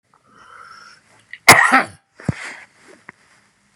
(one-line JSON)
{"exhalation_length": "3.8 s", "exhalation_amplitude": 32768, "exhalation_signal_mean_std_ratio": 0.26, "survey_phase": "beta (2021-08-13 to 2022-03-07)", "age": "45-64", "gender": "Male", "wearing_mask": "No", "symptom_none": true, "symptom_onset": "3 days", "smoker_status": "Never smoked", "respiratory_condition_asthma": false, "respiratory_condition_other": false, "recruitment_source": "REACT", "submission_delay": "1 day", "covid_test_result": "Negative", "covid_test_method": "RT-qPCR", "influenza_a_test_result": "Negative", "influenza_b_test_result": "Negative"}